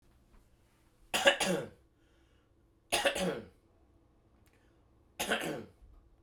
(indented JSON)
{
  "three_cough_length": "6.2 s",
  "three_cough_amplitude": 11236,
  "three_cough_signal_mean_std_ratio": 0.36,
  "survey_phase": "beta (2021-08-13 to 2022-03-07)",
  "age": "45-64",
  "gender": "Male",
  "wearing_mask": "No",
  "symptom_cough_any": true,
  "symptom_fatigue": true,
  "symptom_headache": true,
  "smoker_status": "Never smoked",
  "respiratory_condition_asthma": false,
  "respiratory_condition_other": false,
  "recruitment_source": "Test and Trace",
  "submission_delay": "1 day",
  "covid_test_result": "Positive",
  "covid_test_method": "RT-qPCR",
  "covid_ct_value": 17.5,
  "covid_ct_gene": "ORF1ab gene",
  "covid_ct_mean": 18.0,
  "covid_viral_load": "1200000 copies/ml",
  "covid_viral_load_category": "High viral load (>1M copies/ml)"
}